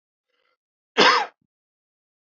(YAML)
cough_length: 2.4 s
cough_amplitude: 25319
cough_signal_mean_std_ratio: 0.27
survey_phase: alpha (2021-03-01 to 2021-08-12)
age: 18-44
gender: Male
wearing_mask: 'No'
symptom_none: true
smoker_status: Never smoked
respiratory_condition_asthma: false
respiratory_condition_other: false
recruitment_source: REACT
submission_delay: 1 day
covid_test_result: Negative
covid_test_method: RT-qPCR